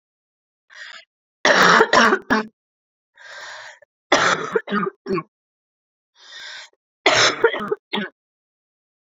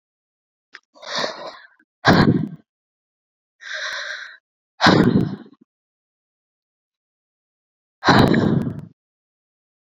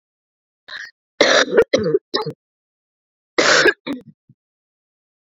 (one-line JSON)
{"three_cough_length": "9.1 s", "three_cough_amplitude": 31048, "three_cough_signal_mean_std_ratio": 0.39, "exhalation_length": "9.9 s", "exhalation_amplitude": 29471, "exhalation_signal_mean_std_ratio": 0.35, "cough_length": "5.3 s", "cough_amplitude": 29061, "cough_signal_mean_std_ratio": 0.37, "survey_phase": "beta (2021-08-13 to 2022-03-07)", "age": "18-44", "gender": "Female", "wearing_mask": "No", "symptom_cough_any": true, "symptom_new_continuous_cough": true, "symptom_runny_or_blocked_nose": true, "symptom_sore_throat": true, "symptom_fatigue": true, "symptom_fever_high_temperature": true, "symptom_headache": true, "symptom_change_to_sense_of_smell_or_taste": true, "symptom_loss_of_taste": true, "symptom_other": true, "symptom_onset": "4 days", "smoker_status": "Never smoked", "respiratory_condition_asthma": false, "respiratory_condition_other": false, "recruitment_source": "Test and Trace", "submission_delay": "1 day", "covid_test_result": "Positive", "covid_test_method": "RT-qPCR", "covid_ct_value": 21.5, "covid_ct_gene": "ORF1ab gene", "covid_ct_mean": 22.5, "covid_viral_load": "43000 copies/ml", "covid_viral_load_category": "Low viral load (10K-1M copies/ml)"}